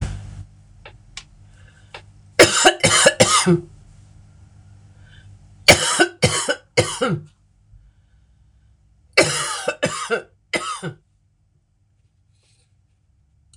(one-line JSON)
{"three_cough_length": "13.6 s", "three_cough_amplitude": 26028, "three_cough_signal_mean_std_ratio": 0.36, "survey_phase": "beta (2021-08-13 to 2022-03-07)", "age": "65+", "gender": "Female", "wearing_mask": "No", "symptom_cough_any": true, "symptom_fatigue": true, "symptom_headache": true, "symptom_onset": "4 days", "smoker_status": "Never smoked", "respiratory_condition_asthma": false, "respiratory_condition_other": false, "recruitment_source": "Test and Trace", "submission_delay": "1 day", "covid_test_result": "Positive", "covid_test_method": "ePCR"}